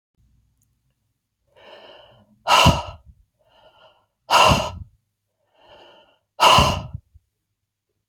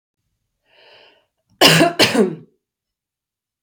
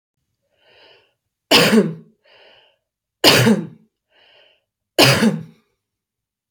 {"exhalation_length": "8.1 s", "exhalation_amplitude": 30322, "exhalation_signal_mean_std_ratio": 0.31, "cough_length": "3.6 s", "cough_amplitude": 32767, "cough_signal_mean_std_ratio": 0.33, "three_cough_length": "6.5 s", "three_cough_amplitude": 32768, "three_cough_signal_mean_std_ratio": 0.35, "survey_phase": "alpha (2021-03-01 to 2021-08-12)", "age": "45-64", "gender": "Female", "wearing_mask": "No", "symptom_shortness_of_breath": true, "symptom_onset": "8 days", "smoker_status": "Never smoked", "respiratory_condition_asthma": false, "respiratory_condition_other": false, "recruitment_source": "Test and Trace", "submission_delay": "2 days", "covid_test_result": "Positive", "covid_test_method": "RT-qPCR", "covid_ct_value": 23.7, "covid_ct_gene": "ORF1ab gene"}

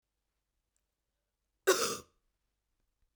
{"cough_length": "3.2 s", "cough_amplitude": 8429, "cough_signal_mean_std_ratio": 0.22, "survey_phase": "beta (2021-08-13 to 2022-03-07)", "age": "45-64", "gender": "Female", "wearing_mask": "No", "symptom_cough_any": true, "symptom_runny_or_blocked_nose": true, "symptom_fatigue": true, "symptom_other": true, "smoker_status": "Never smoked", "respiratory_condition_asthma": false, "respiratory_condition_other": false, "recruitment_source": "Test and Trace", "submission_delay": "2 days", "covid_test_result": "Positive", "covid_test_method": "RT-qPCR"}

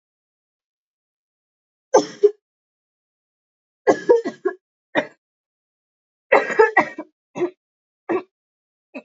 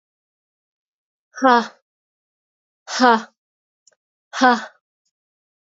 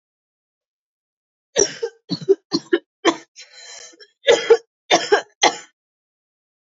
{"three_cough_length": "9.0 s", "three_cough_amplitude": 29803, "three_cough_signal_mean_std_ratio": 0.27, "exhalation_length": "5.6 s", "exhalation_amplitude": 27782, "exhalation_signal_mean_std_ratio": 0.26, "cough_length": "6.7 s", "cough_amplitude": 29652, "cough_signal_mean_std_ratio": 0.3, "survey_phase": "alpha (2021-03-01 to 2021-08-12)", "age": "18-44", "gender": "Female", "wearing_mask": "No", "symptom_cough_any": true, "symptom_fatigue": true, "symptom_fever_high_temperature": true, "symptom_onset": "6 days", "smoker_status": "Never smoked", "respiratory_condition_asthma": false, "respiratory_condition_other": false, "recruitment_source": "Test and Trace", "submission_delay": "1 day", "covid_test_result": "Positive", "covid_test_method": "RT-qPCR", "covid_ct_value": 18.2, "covid_ct_gene": "N gene", "covid_ct_mean": 19.0, "covid_viral_load": "590000 copies/ml", "covid_viral_load_category": "Low viral load (10K-1M copies/ml)"}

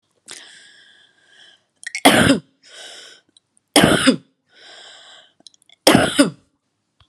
{"three_cough_length": "7.1 s", "three_cough_amplitude": 32768, "three_cough_signal_mean_std_ratio": 0.33, "survey_phase": "beta (2021-08-13 to 2022-03-07)", "age": "45-64", "gender": "Female", "wearing_mask": "No", "symptom_runny_or_blocked_nose": true, "symptom_fatigue": true, "symptom_onset": "12 days", "smoker_status": "Never smoked", "respiratory_condition_asthma": false, "respiratory_condition_other": false, "recruitment_source": "REACT", "submission_delay": "1 day", "covid_test_result": "Negative", "covid_test_method": "RT-qPCR", "influenza_a_test_result": "Negative", "influenza_b_test_result": "Negative"}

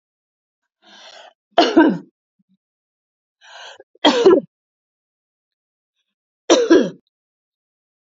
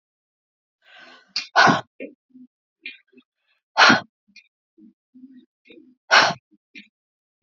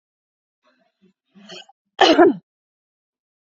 {"three_cough_length": "8.0 s", "three_cough_amplitude": 29325, "three_cough_signal_mean_std_ratio": 0.3, "exhalation_length": "7.4 s", "exhalation_amplitude": 30183, "exhalation_signal_mean_std_ratio": 0.26, "cough_length": "3.5 s", "cough_amplitude": 27814, "cough_signal_mean_std_ratio": 0.25, "survey_phase": "beta (2021-08-13 to 2022-03-07)", "age": "45-64", "gender": "Female", "wearing_mask": "No", "symptom_none": true, "smoker_status": "Never smoked", "respiratory_condition_asthma": false, "respiratory_condition_other": false, "recruitment_source": "REACT", "submission_delay": "1 day", "covid_test_result": "Negative", "covid_test_method": "RT-qPCR", "influenza_a_test_result": "Negative", "influenza_b_test_result": "Negative"}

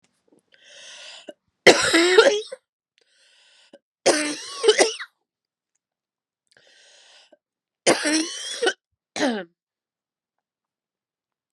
{"three_cough_length": "11.5 s", "three_cough_amplitude": 32768, "three_cough_signal_mean_std_ratio": 0.32, "survey_phase": "beta (2021-08-13 to 2022-03-07)", "age": "45-64", "gender": "Female", "wearing_mask": "No", "symptom_cough_any": true, "symptom_runny_or_blocked_nose": true, "symptom_fatigue": true, "symptom_fever_high_temperature": true, "symptom_headache": true, "symptom_change_to_sense_of_smell_or_taste": true, "symptom_loss_of_taste": true, "symptom_other": true, "smoker_status": "Never smoked", "respiratory_condition_asthma": false, "respiratory_condition_other": false, "recruitment_source": "Test and Trace", "submission_delay": "2 days", "covid_test_result": "Positive", "covid_test_method": "RT-qPCR", "covid_ct_value": 19.3, "covid_ct_gene": "N gene"}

